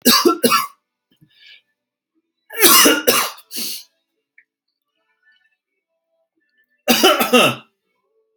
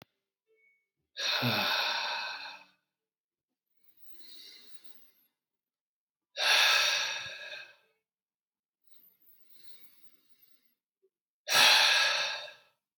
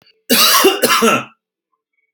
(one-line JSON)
{"three_cough_length": "8.4 s", "three_cough_amplitude": 32768, "three_cough_signal_mean_std_ratio": 0.38, "exhalation_length": "13.0 s", "exhalation_amplitude": 11347, "exhalation_signal_mean_std_ratio": 0.39, "cough_length": "2.1 s", "cough_amplitude": 32768, "cough_signal_mean_std_ratio": 0.57, "survey_phase": "alpha (2021-03-01 to 2021-08-12)", "age": "18-44", "gender": "Male", "wearing_mask": "No", "symptom_fatigue": true, "symptom_onset": "12 days", "smoker_status": "Never smoked", "respiratory_condition_asthma": false, "respiratory_condition_other": false, "recruitment_source": "REACT", "submission_delay": "2 days", "covid_test_result": "Negative", "covid_test_method": "RT-qPCR"}